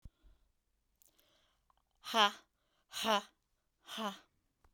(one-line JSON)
{"exhalation_length": "4.7 s", "exhalation_amplitude": 5341, "exhalation_signal_mean_std_ratio": 0.26, "survey_phase": "beta (2021-08-13 to 2022-03-07)", "age": "65+", "gender": "Female", "wearing_mask": "No", "symptom_none": true, "smoker_status": "Never smoked", "respiratory_condition_asthma": false, "respiratory_condition_other": false, "recruitment_source": "REACT", "submission_delay": "2 days", "covid_test_result": "Negative", "covid_test_method": "RT-qPCR"}